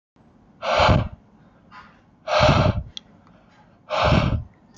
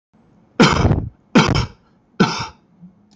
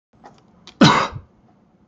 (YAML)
exhalation_length: 4.8 s
exhalation_amplitude: 22316
exhalation_signal_mean_std_ratio: 0.48
three_cough_length: 3.2 s
three_cough_amplitude: 28959
three_cough_signal_mean_std_ratio: 0.44
cough_length: 1.9 s
cough_amplitude: 30604
cough_signal_mean_std_ratio: 0.31
survey_phase: alpha (2021-03-01 to 2021-08-12)
age: 18-44
gender: Male
wearing_mask: 'Yes'
symptom_none: true
smoker_status: Never smoked
respiratory_condition_asthma: false
respiratory_condition_other: false
recruitment_source: REACT
submission_delay: 1 day
covid_test_result: Negative
covid_test_method: RT-qPCR